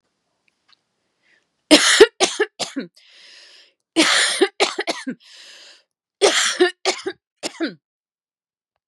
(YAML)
three_cough_length: 8.9 s
three_cough_amplitude: 32768
three_cough_signal_mean_std_ratio: 0.36
survey_phase: beta (2021-08-13 to 2022-03-07)
age: 45-64
gender: Female
wearing_mask: 'No'
symptom_fatigue: true
symptom_onset: 12 days
smoker_status: Never smoked
respiratory_condition_asthma: false
respiratory_condition_other: false
recruitment_source: REACT
submission_delay: 1 day
covid_test_result: Negative
covid_test_method: RT-qPCR
influenza_a_test_result: Negative
influenza_b_test_result: Negative